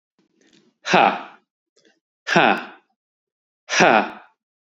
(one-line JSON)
{"exhalation_length": "4.8 s", "exhalation_amplitude": 28783, "exhalation_signal_mean_std_ratio": 0.34, "survey_phase": "beta (2021-08-13 to 2022-03-07)", "age": "18-44", "gender": "Male", "wearing_mask": "No", "symptom_none": true, "smoker_status": "Never smoked", "respiratory_condition_asthma": false, "respiratory_condition_other": false, "recruitment_source": "REACT", "submission_delay": "2 days", "covid_test_result": "Negative", "covid_test_method": "RT-qPCR", "influenza_a_test_result": "Negative", "influenza_b_test_result": "Negative"}